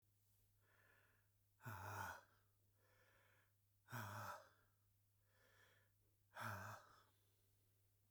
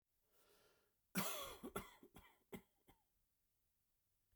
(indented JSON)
{
  "exhalation_length": "8.1 s",
  "exhalation_amplitude": 418,
  "exhalation_signal_mean_std_ratio": 0.44,
  "cough_length": "4.4 s",
  "cough_amplitude": 1255,
  "cough_signal_mean_std_ratio": 0.32,
  "survey_phase": "beta (2021-08-13 to 2022-03-07)",
  "age": "45-64",
  "gender": "Male",
  "wearing_mask": "No",
  "symptom_none": true,
  "symptom_onset": "7 days",
  "smoker_status": "Ex-smoker",
  "respiratory_condition_asthma": true,
  "respiratory_condition_other": false,
  "recruitment_source": "REACT",
  "submission_delay": "5 days",
  "covid_test_result": "Negative",
  "covid_test_method": "RT-qPCR",
  "influenza_a_test_result": "Negative",
  "influenza_b_test_result": "Negative"
}